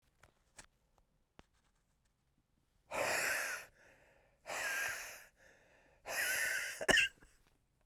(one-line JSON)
{"exhalation_length": "7.9 s", "exhalation_amplitude": 5788, "exhalation_signal_mean_std_ratio": 0.43, "survey_phase": "beta (2021-08-13 to 2022-03-07)", "age": "18-44", "gender": "Male", "wearing_mask": "Yes", "symptom_cough_any": true, "symptom_shortness_of_breath": true, "symptom_fatigue": true, "symptom_headache": true, "symptom_change_to_sense_of_smell_or_taste": true, "symptom_onset": "6 days", "smoker_status": "Never smoked", "respiratory_condition_asthma": false, "respiratory_condition_other": false, "recruitment_source": "Test and Trace", "submission_delay": "2 days", "covid_test_result": "Positive", "covid_test_method": "RT-qPCR", "covid_ct_value": 14.5, "covid_ct_gene": "N gene", "covid_ct_mean": 15.1, "covid_viral_load": "11000000 copies/ml", "covid_viral_load_category": "High viral load (>1M copies/ml)"}